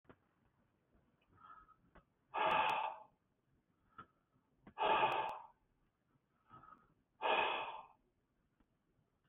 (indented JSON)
{
  "exhalation_length": "9.3 s",
  "exhalation_amplitude": 2993,
  "exhalation_signal_mean_std_ratio": 0.37,
  "survey_phase": "beta (2021-08-13 to 2022-03-07)",
  "age": "65+",
  "gender": "Male",
  "wearing_mask": "No",
  "symptom_none": true,
  "smoker_status": "Ex-smoker",
  "respiratory_condition_asthma": false,
  "respiratory_condition_other": false,
  "recruitment_source": "REACT",
  "submission_delay": "1 day",
  "covid_test_result": "Negative",
  "covid_test_method": "RT-qPCR",
  "influenza_a_test_result": "Negative",
  "influenza_b_test_result": "Negative"
}